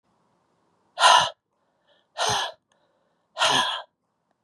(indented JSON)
{
  "exhalation_length": "4.4 s",
  "exhalation_amplitude": 24789,
  "exhalation_signal_mean_std_ratio": 0.35,
  "survey_phase": "beta (2021-08-13 to 2022-03-07)",
  "age": "45-64",
  "gender": "Female",
  "wearing_mask": "No",
  "symptom_cough_any": true,
  "symptom_new_continuous_cough": true,
  "symptom_runny_or_blocked_nose": true,
  "symptom_shortness_of_breath": true,
  "symptom_fatigue": true,
  "symptom_fever_high_temperature": true,
  "symptom_headache": true,
  "symptom_change_to_sense_of_smell_or_taste": true,
  "symptom_onset": "6 days",
  "smoker_status": "Never smoked",
  "respiratory_condition_asthma": false,
  "respiratory_condition_other": true,
  "recruitment_source": "Test and Trace",
  "submission_delay": "2 days",
  "covid_test_result": "Positive",
  "covid_test_method": "RT-qPCR",
  "covid_ct_value": 11.1,
  "covid_ct_gene": "ORF1ab gene",
  "covid_ct_mean": 11.6,
  "covid_viral_load": "160000000 copies/ml",
  "covid_viral_load_category": "High viral load (>1M copies/ml)"
}